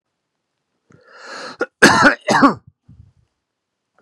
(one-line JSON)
{"cough_length": "4.0 s", "cough_amplitude": 32768, "cough_signal_mean_std_ratio": 0.32, "survey_phase": "beta (2021-08-13 to 2022-03-07)", "age": "45-64", "gender": "Male", "wearing_mask": "No", "symptom_cough_any": true, "symptom_runny_or_blocked_nose": true, "symptom_fatigue": true, "symptom_headache": true, "symptom_onset": "5 days", "smoker_status": "Never smoked", "respiratory_condition_asthma": false, "respiratory_condition_other": false, "recruitment_source": "Test and Trace", "submission_delay": "1 day", "covid_test_result": "Positive", "covid_test_method": "RT-qPCR", "covid_ct_value": 14.5, "covid_ct_gene": "N gene", "covid_ct_mean": 15.1, "covid_viral_load": "11000000 copies/ml", "covid_viral_load_category": "High viral load (>1M copies/ml)"}